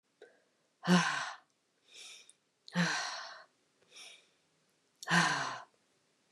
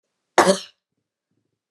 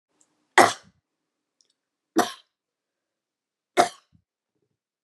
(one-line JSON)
{"exhalation_length": "6.3 s", "exhalation_amplitude": 5911, "exhalation_signal_mean_std_ratio": 0.37, "cough_length": "1.7 s", "cough_amplitude": 32199, "cough_signal_mean_std_ratio": 0.25, "three_cough_length": "5.0 s", "three_cough_amplitude": 32496, "three_cough_signal_mean_std_ratio": 0.18, "survey_phase": "beta (2021-08-13 to 2022-03-07)", "age": "45-64", "gender": "Female", "wearing_mask": "No", "symptom_none": true, "smoker_status": "Never smoked", "respiratory_condition_asthma": false, "respiratory_condition_other": false, "recruitment_source": "REACT", "submission_delay": "2 days", "covid_test_result": "Negative", "covid_test_method": "RT-qPCR", "influenza_a_test_result": "Negative", "influenza_b_test_result": "Negative"}